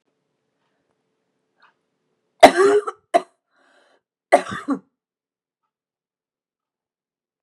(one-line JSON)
{"three_cough_length": "7.4 s", "three_cough_amplitude": 32768, "three_cough_signal_mean_std_ratio": 0.21, "survey_phase": "beta (2021-08-13 to 2022-03-07)", "age": "45-64", "gender": "Female", "wearing_mask": "No", "symptom_fatigue": true, "smoker_status": "Never smoked", "respiratory_condition_asthma": false, "respiratory_condition_other": false, "recruitment_source": "REACT", "submission_delay": "5 days", "covid_test_result": "Negative", "covid_test_method": "RT-qPCR", "influenza_a_test_result": "Unknown/Void", "influenza_b_test_result": "Unknown/Void"}